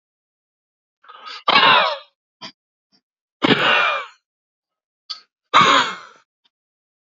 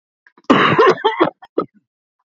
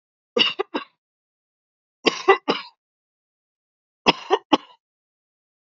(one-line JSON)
{"exhalation_length": "7.2 s", "exhalation_amplitude": 32768, "exhalation_signal_mean_std_ratio": 0.36, "cough_length": "2.4 s", "cough_amplitude": 29138, "cough_signal_mean_std_ratio": 0.45, "three_cough_length": "5.6 s", "three_cough_amplitude": 29627, "three_cough_signal_mean_std_ratio": 0.25, "survey_phase": "beta (2021-08-13 to 2022-03-07)", "age": "45-64", "gender": "Male", "wearing_mask": "No", "symptom_none": true, "smoker_status": "Ex-smoker", "respiratory_condition_asthma": false, "respiratory_condition_other": false, "recruitment_source": "REACT", "submission_delay": "2 days", "covid_test_result": "Negative", "covid_test_method": "RT-qPCR"}